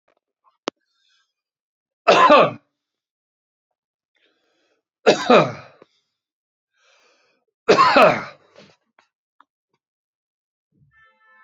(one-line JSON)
{"three_cough_length": "11.4 s", "three_cough_amplitude": 30635, "three_cough_signal_mean_std_ratio": 0.27, "survey_phase": "beta (2021-08-13 to 2022-03-07)", "age": "45-64", "gender": "Male", "wearing_mask": "No", "symptom_cough_any": true, "symptom_runny_or_blocked_nose": true, "symptom_sore_throat": true, "symptom_fatigue": true, "symptom_other": true, "symptom_onset": "3 days", "smoker_status": "Ex-smoker", "respiratory_condition_asthma": false, "respiratory_condition_other": true, "recruitment_source": "Test and Trace", "submission_delay": "2 days", "covid_test_result": "Positive", "covid_test_method": "RT-qPCR"}